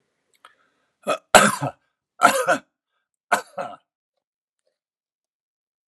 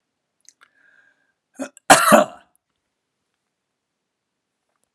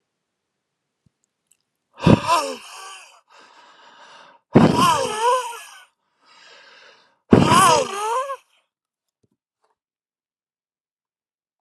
{"three_cough_length": "5.9 s", "three_cough_amplitude": 32768, "three_cough_signal_mean_std_ratio": 0.26, "cough_length": "4.9 s", "cough_amplitude": 32768, "cough_signal_mean_std_ratio": 0.2, "exhalation_length": "11.6 s", "exhalation_amplitude": 32768, "exhalation_signal_mean_std_ratio": 0.34, "survey_phase": "beta (2021-08-13 to 2022-03-07)", "age": "45-64", "gender": "Male", "wearing_mask": "No", "symptom_none": true, "smoker_status": "Ex-smoker", "respiratory_condition_asthma": false, "respiratory_condition_other": false, "recruitment_source": "REACT", "submission_delay": "1 day", "covid_test_result": "Negative", "covid_test_method": "RT-qPCR"}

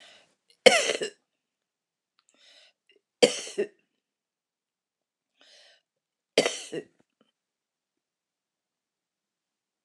{"three_cough_length": "9.8 s", "three_cough_amplitude": 29203, "three_cough_signal_mean_std_ratio": 0.18, "survey_phase": "alpha (2021-03-01 to 2021-08-12)", "age": "65+", "gender": "Female", "wearing_mask": "No", "symptom_none": true, "smoker_status": "Never smoked", "respiratory_condition_asthma": true, "respiratory_condition_other": false, "recruitment_source": "REACT", "submission_delay": "2 days", "covid_test_result": "Negative", "covid_test_method": "RT-qPCR"}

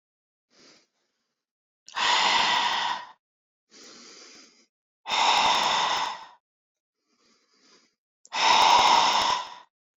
{"exhalation_length": "10.0 s", "exhalation_amplitude": 14733, "exhalation_signal_mean_std_ratio": 0.48, "survey_phase": "beta (2021-08-13 to 2022-03-07)", "age": "18-44", "gender": "Female", "wearing_mask": "No", "symptom_none": true, "symptom_onset": "12 days", "smoker_status": "Never smoked", "respiratory_condition_asthma": true, "respiratory_condition_other": false, "recruitment_source": "REACT", "submission_delay": "1 day", "covid_test_result": "Negative", "covid_test_method": "RT-qPCR"}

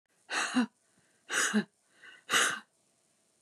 {"exhalation_length": "3.4 s", "exhalation_amplitude": 6905, "exhalation_signal_mean_std_ratio": 0.43, "survey_phase": "beta (2021-08-13 to 2022-03-07)", "age": "45-64", "gender": "Female", "wearing_mask": "No", "symptom_none": true, "smoker_status": "Never smoked", "respiratory_condition_asthma": false, "respiratory_condition_other": false, "recruitment_source": "REACT", "submission_delay": "2 days", "covid_test_result": "Negative", "covid_test_method": "RT-qPCR", "influenza_a_test_result": "Negative", "influenza_b_test_result": "Negative"}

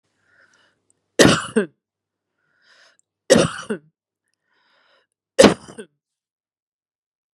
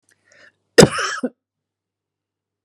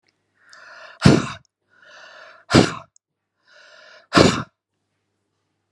{"three_cough_length": "7.3 s", "three_cough_amplitude": 32768, "three_cough_signal_mean_std_ratio": 0.23, "cough_length": "2.6 s", "cough_amplitude": 32768, "cough_signal_mean_std_ratio": 0.22, "exhalation_length": "5.7 s", "exhalation_amplitude": 32768, "exhalation_signal_mean_std_ratio": 0.26, "survey_phase": "beta (2021-08-13 to 2022-03-07)", "age": "45-64", "gender": "Female", "wearing_mask": "No", "symptom_none": true, "smoker_status": "Current smoker (11 or more cigarettes per day)", "respiratory_condition_asthma": false, "respiratory_condition_other": false, "recruitment_source": "REACT", "submission_delay": "1 day", "covid_test_result": "Negative", "covid_test_method": "RT-qPCR"}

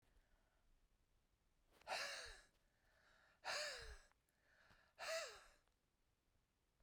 {"exhalation_length": "6.8 s", "exhalation_amplitude": 699, "exhalation_signal_mean_std_ratio": 0.4, "survey_phase": "beta (2021-08-13 to 2022-03-07)", "age": "65+", "gender": "Female", "wearing_mask": "No", "symptom_none": true, "smoker_status": "Ex-smoker", "respiratory_condition_asthma": false, "respiratory_condition_other": false, "recruitment_source": "REACT", "submission_delay": "3 days", "covid_test_result": "Negative", "covid_test_method": "RT-qPCR"}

